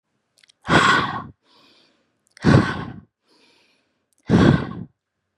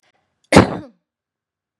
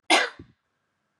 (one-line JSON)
{"exhalation_length": "5.4 s", "exhalation_amplitude": 31404, "exhalation_signal_mean_std_ratio": 0.38, "cough_length": "1.8 s", "cough_amplitude": 32768, "cough_signal_mean_std_ratio": 0.24, "three_cough_length": "1.2 s", "three_cough_amplitude": 17112, "three_cough_signal_mean_std_ratio": 0.31, "survey_phase": "beta (2021-08-13 to 2022-03-07)", "age": "45-64", "gender": "Female", "wearing_mask": "No", "symptom_none": true, "smoker_status": "Ex-smoker", "respiratory_condition_asthma": false, "respiratory_condition_other": false, "recruitment_source": "REACT", "submission_delay": "1 day", "covid_test_result": "Negative", "covid_test_method": "RT-qPCR", "influenza_a_test_result": "Negative", "influenza_b_test_result": "Negative"}